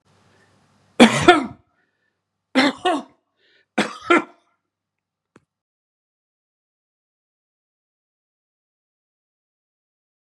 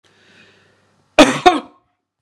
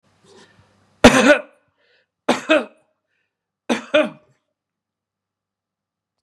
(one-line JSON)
{"three_cough_length": "10.2 s", "three_cough_amplitude": 32768, "three_cough_signal_mean_std_ratio": 0.22, "cough_length": "2.2 s", "cough_amplitude": 32768, "cough_signal_mean_std_ratio": 0.28, "exhalation_length": "6.2 s", "exhalation_amplitude": 32768, "exhalation_signal_mean_std_ratio": 0.26, "survey_phase": "beta (2021-08-13 to 2022-03-07)", "age": "65+", "gender": "Male", "wearing_mask": "No", "symptom_runny_or_blocked_nose": true, "symptom_onset": "12 days", "smoker_status": "Never smoked", "respiratory_condition_asthma": false, "respiratory_condition_other": false, "recruitment_source": "REACT", "submission_delay": "2 days", "covid_test_result": "Negative", "covid_test_method": "RT-qPCR", "influenza_a_test_result": "Negative", "influenza_b_test_result": "Negative"}